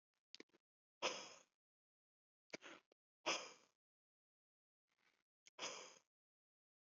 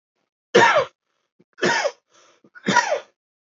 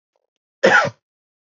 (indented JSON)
{
  "exhalation_length": "6.8 s",
  "exhalation_amplitude": 1437,
  "exhalation_signal_mean_std_ratio": 0.24,
  "three_cough_length": "3.6 s",
  "three_cough_amplitude": 27237,
  "three_cough_signal_mean_std_ratio": 0.39,
  "cough_length": "1.5 s",
  "cough_amplitude": 32768,
  "cough_signal_mean_std_ratio": 0.33,
  "survey_phase": "beta (2021-08-13 to 2022-03-07)",
  "age": "18-44",
  "gender": "Male",
  "wearing_mask": "No",
  "symptom_other": true,
  "symptom_onset": "6 days",
  "smoker_status": "Ex-smoker",
  "respiratory_condition_asthma": false,
  "respiratory_condition_other": false,
  "recruitment_source": "REACT",
  "submission_delay": "0 days",
  "covid_test_result": "Negative",
  "covid_test_method": "RT-qPCR",
  "influenza_a_test_result": "Negative",
  "influenza_b_test_result": "Negative"
}